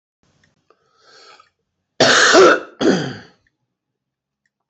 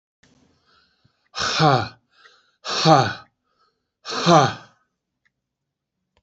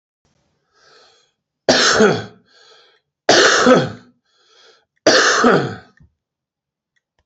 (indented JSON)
{
  "cough_length": "4.7 s",
  "cough_amplitude": 30463,
  "cough_signal_mean_std_ratio": 0.36,
  "exhalation_length": "6.2 s",
  "exhalation_amplitude": 29506,
  "exhalation_signal_mean_std_ratio": 0.33,
  "three_cough_length": "7.3 s",
  "three_cough_amplitude": 29744,
  "three_cough_signal_mean_std_ratio": 0.41,
  "survey_phase": "beta (2021-08-13 to 2022-03-07)",
  "age": "45-64",
  "gender": "Male",
  "wearing_mask": "No",
  "symptom_cough_any": true,
  "symptom_shortness_of_breath": true,
  "symptom_fatigue": true,
  "symptom_headache": true,
  "symptom_other": true,
  "smoker_status": "Ex-smoker",
  "respiratory_condition_asthma": false,
  "respiratory_condition_other": false,
  "recruitment_source": "Test and Trace",
  "submission_delay": "2 days",
  "covid_test_result": "Positive",
  "covid_test_method": "LFT"
}